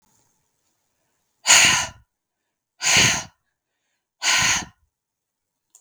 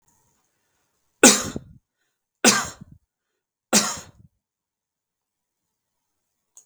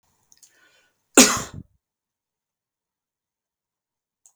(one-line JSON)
{"exhalation_length": "5.8 s", "exhalation_amplitude": 32768, "exhalation_signal_mean_std_ratio": 0.35, "three_cough_length": "6.7 s", "three_cough_amplitude": 32768, "three_cough_signal_mean_std_ratio": 0.22, "cough_length": "4.4 s", "cough_amplitude": 32768, "cough_signal_mean_std_ratio": 0.16, "survey_phase": "beta (2021-08-13 to 2022-03-07)", "age": "45-64", "gender": "Male", "wearing_mask": "No", "symptom_none": true, "smoker_status": "Ex-smoker", "respiratory_condition_asthma": false, "respiratory_condition_other": false, "recruitment_source": "REACT", "submission_delay": "3 days", "covid_test_result": "Negative", "covid_test_method": "RT-qPCR", "influenza_a_test_result": "Negative", "influenza_b_test_result": "Negative"}